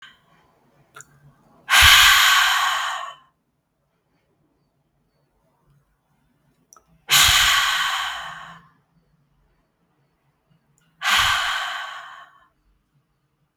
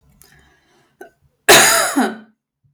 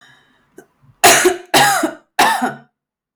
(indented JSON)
{
  "exhalation_length": "13.6 s",
  "exhalation_amplitude": 32768,
  "exhalation_signal_mean_std_ratio": 0.38,
  "cough_length": "2.7 s",
  "cough_amplitude": 32768,
  "cough_signal_mean_std_ratio": 0.38,
  "three_cough_length": "3.2 s",
  "three_cough_amplitude": 32768,
  "three_cough_signal_mean_std_ratio": 0.48,
  "survey_phase": "beta (2021-08-13 to 2022-03-07)",
  "age": "18-44",
  "gender": "Female",
  "wearing_mask": "No",
  "symptom_other": true,
  "smoker_status": "Never smoked",
  "respiratory_condition_asthma": false,
  "respiratory_condition_other": false,
  "recruitment_source": "Test and Trace",
  "submission_delay": "2 days",
  "covid_test_result": "Positive",
  "covid_test_method": "RT-qPCR",
  "covid_ct_value": 13.2,
  "covid_ct_gene": "ORF1ab gene"
}